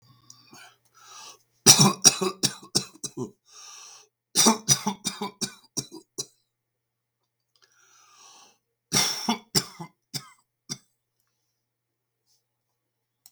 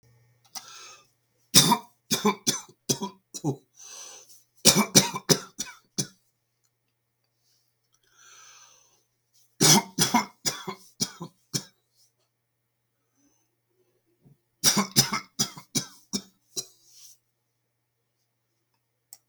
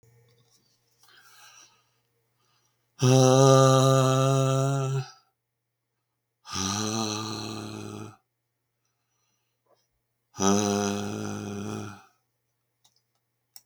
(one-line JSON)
{"cough_length": "13.3 s", "cough_amplitude": 32768, "cough_signal_mean_std_ratio": 0.27, "three_cough_length": "19.3 s", "three_cough_amplitude": 32594, "three_cough_signal_mean_std_ratio": 0.28, "exhalation_length": "13.7 s", "exhalation_amplitude": 19074, "exhalation_signal_mean_std_ratio": 0.41, "survey_phase": "beta (2021-08-13 to 2022-03-07)", "age": "65+", "gender": "Male", "wearing_mask": "No", "symptom_none": true, "smoker_status": "Ex-smoker", "respiratory_condition_asthma": true, "respiratory_condition_other": false, "recruitment_source": "REACT", "submission_delay": "2 days", "covid_test_result": "Negative", "covid_test_method": "RT-qPCR"}